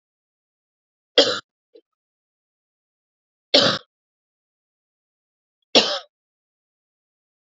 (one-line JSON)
{"three_cough_length": "7.6 s", "three_cough_amplitude": 30668, "three_cough_signal_mean_std_ratio": 0.2, "survey_phase": "beta (2021-08-13 to 2022-03-07)", "age": "18-44", "gender": "Female", "wearing_mask": "No", "symptom_cough_any": true, "symptom_runny_or_blocked_nose": true, "symptom_shortness_of_breath": true, "symptom_sore_throat": true, "symptom_fatigue": true, "symptom_other": true, "symptom_onset": "3 days", "smoker_status": "Never smoked", "respiratory_condition_asthma": false, "respiratory_condition_other": false, "recruitment_source": "Test and Trace", "submission_delay": "1 day", "covid_test_result": "Positive", "covid_test_method": "ePCR"}